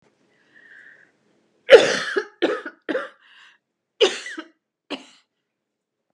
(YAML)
cough_length: 6.1 s
cough_amplitude: 32768
cough_signal_mean_std_ratio: 0.25
survey_phase: beta (2021-08-13 to 2022-03-07)
age: 65+
gender: Female
wearing_mask: 'No'
symptom_none: true
smoker_status: Never smoked
respiratory_condition_asthma: false
respiratory_condition_other: false
recruitment_source: REACT
submission_delay: 2 days
covid_test_result: Negative
covid_test_method: RT-qPCR
influenza_a_test_result: Negative
influenza_b_test_result: Negative